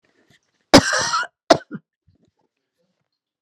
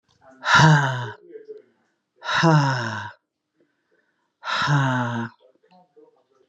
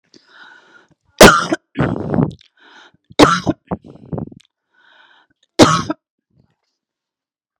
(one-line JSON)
{"cough_length": "3.4 s", "cough_amplitude": 32768, "cough_signal_mean_std_ratio": 0.25, "exhalation_length": "6.5 s", "exhalation_amplitude": 25305, "exhalation_signal_mean_std_ratio": 0.46, "three_cough_length": "7.6 s", "three_cough_amplitude": 32768, "three_cough_signal_mean_std_ratio": 0.3, "survey_phase": "beta (2021-08-13 to 2022-03-07)", "age": "45-64", "gender": "Female", "wearing_mask": "No", "symptom_runny_or_blocked_nose": true, "smoker_status": "Ex-smoker", "respiratory_condition_asthma": false, "respiratory_condition_other": false, "recruitment_source": "REACT", "submission_delay": "1 day", "covid_test_result": "Negative", "covid_test_method": "RT-qPCR"}